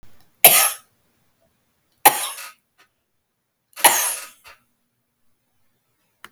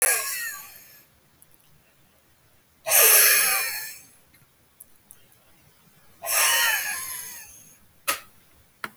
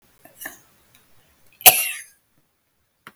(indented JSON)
{
  "three_cough_length": "6.3 s",
  "three_cough_amplitude": 32768,
  "three_cough_signal_mean_std_ratio": 0.25,
  "exhalation_length": "9.0 s",
  "exhalation_amplitude": 23771,
  "exhalation_signal_mean_std_ratio": 0.42,
  "cough_length": "3.2 s",
  "cough_amplitude": 32768,
  "cough_signal_mean_std_ratio": 0.19,
  "survey_phase": "beta (2021-08-13 to 2022-03-07)",
  "age": "65+",
  "gender": "Female",
  "wearing_mask": "No",
  "symptom_none": true,
  "smoker_status": "Never smoked",
  "respiratory_condition_asthma": false,
  "respiratory_condition_other": true,
  "recruitment_source": "REACT",
  "submission_delay": "1 day",
  "covid_test_result": "Negative",
  "covid_test_method": "RT-qPCR"
}